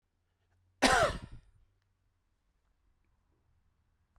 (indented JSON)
{
  "cough_length": "4.2 s",
  "cough_amplitude": 9548,
  "cough_signal_mean_std_ratio": 0.24,
  "survey_phase": "beta (2021-08-13 to 2022-03-07)",
  "age": "45-64",
  "gender": "Male",
  "wearing_mask": "No",
  "symptom_none": true,
  "smoker_status": "Never smoked",
  "respiratory_condition_asthma": false,
  "respiratory_condition_other": false,
  "recruitment_source": "REACT",
  "submission_delay": "1 day",
  "covid_test_result": "Negative",
  "covid_test_method": "RT-qPCR"
}